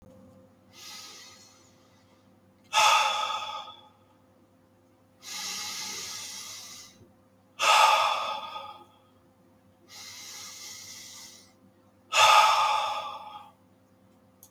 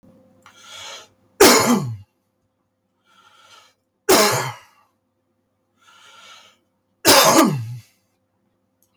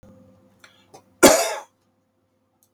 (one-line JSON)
{"exhalation_length": "14.5 s", "exhalation_amplitude": 16028, "exhalation_signal_mean_std_ratio": 0.39, "three_cough_length": "9.0 s", "three_cough_amplitude": 32768, "three_cough_signal_mean_std_ratio": 0.33, "cough_length": "2.7 s", "cough_amplitude": 32768, "cough_signal_mean_std_ratio": 0.24, "survey_phase": "beta (2021-08-13 to 2022-03-07)", "age": "45-64", "gender": "Male", "wearing_mask": "No", "symptom_none": true, "smoker_status": "Never smoked", "respiratory_condition_asthma": false, "respiratory_condition_other": false, "recruitment_source": "REACT", "submission_delay": "1 day", "covid_test_result": "Negative", "covid_test_method": "RT-qPCR"}